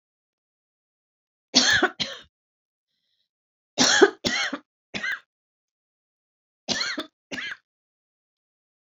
{
  "three_cough_length": "9.0 s",
  "three_cough_amplitude": 25877,
  "three_cough_signal_mean_std_ratio": 0.3,
  "survey_phase": "beta (2021-08-13 to 2022-03-07)",
  "age": "65+",
  "gender": "Female",
  "wearing_mask": "No",
  "symptom_none": true,
  "smoker_status": "Never smoked",
  "respiratory_condition_asthma": false,
  "respiratory_condition_other": false,
  "recruitment_source": "REACT",
  "submission_delay": "3 days",
  "covid_test_result": "Negative",
  "covid_test_method": "RT-qPCR"
}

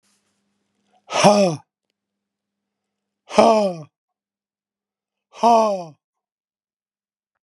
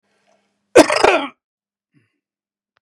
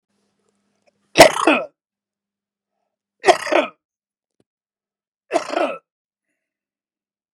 {
  "exhalation_length": "7.4 s",
  "exhalation_amplitude": 32767,
  "exhalation_signal_mean_std_ratio": 0.31,
  "cough_length": "2.8 s",
  "cough_amplitude": 32768,
  "cough_signal_mean_std_ratio": 0.27,
  "three_cough_length": "7.3 s",
  "three_cough_amplitude": 32768,
  "three_cough_signal_mean_std_ratio": 0.24,
  "survey_phase": "beta (2021-08-13 to 2022-03-07)",
  "age": "65+",
  "gender": "Male",
  "wearing_mask": "No",
  "symptom_cough_any": true,
  "symptom_runny_or_blocked_nose": true,
  "symptom_abdominal_pain": true,
  "symptom_headache": true,
  "smoker_status": "Ex-smoker",
  "respiratory_condition_asthma": true,
  "respiratory_condition_other": false,
  "recruitment_source": "Test and Trace",
  "submission_delay": "2 days",
  "covid_test_result": "Positive",
  "covid_test_method": "RT-qPCR",
  "covid_ct_value": 21.5,
  "covid_ct_gene": "ORF1ab gene",
  "covid_ct_mean": 22.1,
  "covid_viral_load": "55000 copies/ml",
  "covid_viral_load_category": "Low viral load (10K-1M copies/ml)"
}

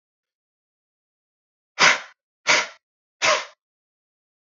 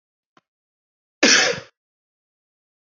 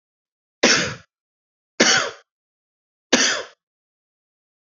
{
  "exhalation_length": "4.4 s",
  "exhalation_amplitude": 29010,
  "exhalation_signal_mean_std_ratio": 0.27,
  "cough_length": "2.9 s",
  "cough_amplitude": 27530,
  "cough_signal_mean_std_ratio": 0.26,
  "three_cough_length": "4.6 s",
  "three_cough_amplitude": 29003,
  "three_cough_signal_mean_std_ratio": 0.33,
  "survey_phase": "beta (2021-08-13 to 2022-03-07)",
  "age": "18-44",
  "gender": "Male",
  "wearing_mask": "No",
  "symptom_cough_any": true,
  "symptom_runny_or_blocked_nose": true,
  "symptom_shortness_of_breath": true,
  "symptom_fatigue": true,
  "symptom_onset": "2 days",
  "smoker_status": "Current smoker (1 to 10 cigarettes per day)",
  "respiratory_condition_asthma": false,
  "respiratory_condition_other": false,
  "recruitment_source": "Test and Trace",
  "submission_delay": "1 day",
  "covid_test_result": "Positive",
  "covid_test_method": "RT-qPCR",
  "covid_ct_value": 19.6,
  "covid_ct_gene": "ORF1ab gene",
  "covid_ct_mean": 20.1,
  "covid_viral_load": "250000 copies/ml",
  "covid_viral_load_category": "Low viral load (10K-1M copies/ml)"
}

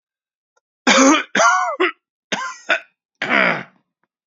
{
  "three_cough_length": "4.3 s",
  "three_cough_amplitude": 30617,
  "three_cough_signal_mean_std_ratio": 0.46,
  "survey_phase": "beta (2021-08-13 to 2022-03-07)",
  "age": "45-64",
  "gender": "Male",
  "wearing_mask": "No",
  "symptom_cough_any": true,
  "smoker_status": "Never smoked",
  "respiratory_condition_asthma": false,
  "respiratory_condition_other": false,
  "recruitment_source": "REACT",
  "submission_delay": "4 days",
  "covid_test_result": "Positive",
  "covid_test_method": "RT-qPCR",
  "covid_ct_value": 25.0,
  "covid_ct_gene": "N gene",
  "influenza_a_test_result": "Negative",
  "influenza_b_test_result": "Negative"
}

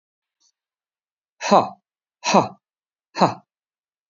{
  "exhalation_length": "4.1 s",
  "exhalation_amplitude": 28617,
  "exhalation_signal_mean_std_ratio": 0.26,
  "survey_phase": "beta (2021-08-13 to 2022-03-07)",
  "age": "45-64",
  "gender": "Male",
  "wearing_mask": "No",
  "symptom_none": true,
  "smoker_status": "Never smoked",
  "respiratory_condition_asthma": false,
  "respiratory_condition_other": false,
  "recruitment_source": "REACT",
  "submission_delay": "1 day",
  "covid_test_result": "Negative",
  "covid_test_method": "RT-qPCR",
  "influenza_a_test_result": "Negative",
  "influenza_b_test_result": "Negative"
}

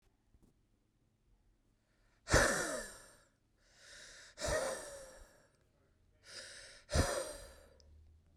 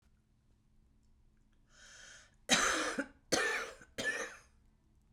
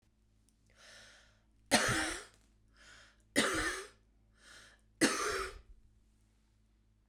{
  "exhalation_length": "8.4 s",
  "exhalation_amplitude": 6996,
  "exhalation_signal_mean_std_ratio": 0.35,
  "cough_length": "5.1 s",
  "cough_amplitude": 8291,
  "cough_signal_mean_std_ratio": 0.41,
  "three_cough_length": "7.1 s",
  "three_cough_amplitude": 7907,
  "three_cough_signal_mean_std_ratio": 0.37,
  "survey_phase": "beta (2021-08-13 to 2022-03-07)",
  "age": "45-64",
  "gender": "Female",
  "wearing_mask": "No",
  "symptom_cough_any": true,
  "symptom_shortness_of_breath": true,
  "symptom_fatigue": true,
  "symptom_headache": true,
  "symptom_change_to_sense_of_smell_or_taste": true,
  "smoker_status": "Current smoker (11 or more cigarettes per day)",
  "respiratory_condition_asthma": true,
  "respiratory_condition_other": false,
  "recruitment_source": "REACT",
  "submission_delay": "1 day",
  "covid_test_result": "Negative",
  "covid_test_method": "RT-qPCR"
}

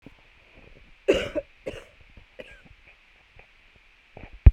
{
  "three_cough_length": "4.5 s",
  "three_cough_amplitude": 32768,
  "three_cough_signal_mean_std_ratio": 0.18,
  "survey_phase": "beta (2021-08-13 to 2022-03-07)",
  "age": "45-64",
  "gender": "Female",
  "wearing_mask": "No",
  "symptom_none": true,
  "smoker_status": "Never smoked",
  "respiratory_condition_asthma": true,
  "respiratory_condition_other": false,
  "recruitment_source": "REACT",
  "submission_delay": "2 days",
  "covid_test_result": "Negative",
  "covid_test_method": "RT-qPCR",
  "influenza_a_test_result": "Negative",
  "influenza_b_test_result": "Negative"
}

